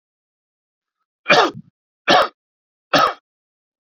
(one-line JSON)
{"three_cough_length": "3.9 s", "three_cough_amplitude": 28677, "three_cough_signal_mean_std_ratio": 0.31, "survey_phase": "beta (2021-08-13 to 2022-03-07)", "age": "45-64", "gender": "Male", "wearing_mask": "No", "symptom_none": true, "smoker_status": "Never smoked", "respiratory_condition_asthma": false, "respiratory_condition_other": false, "recruitment_source": "REACT", "submission_delay": "2 days", "covid_test_result": "Negative", "covid_test_method": "RT-qPCR"}